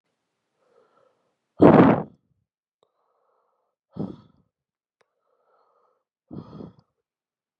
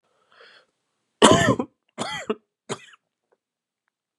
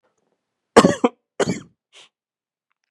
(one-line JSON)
{"exhalation_length": "7.6 s", "exhalation_amplitude": 32767, "exhalation_signal_mean_std_ratio": 0.19, "three_cough_length": "4.2 s", "three_cough_amplitude": 32767, "three_cough_signal_mean_std_ratio": 0.27, "cough_length": "2.9 s", "cough_amplitude": 32768, "cough_signal_mean_std_ratio": 0.24, "survey_phase": "beta (2021-08-13 to 2022-03-07)", "age": "18-44", "gender": "Male", "wearing_mask": "No", "symptom_cough_any": true, "symptom_runny_or_blocked_nose": true, "symptom_sore_throat": true, "symptom_fever_high_temperature": true, "symptom_headache": true, "symptom_onset": "3 days", "smoker_status": "Never smoked", "respiratory_condition_asthma": false, "respiratory_condition_other": false, "recruitment_source": "Test and Trace", "submission_delay": "2 days", "covid_test_result": "Positive", "covid_test_method": "RT-qPCR", "covid_ct_value": 17.0, "covid_ct_gene": "ORF1ab gene"}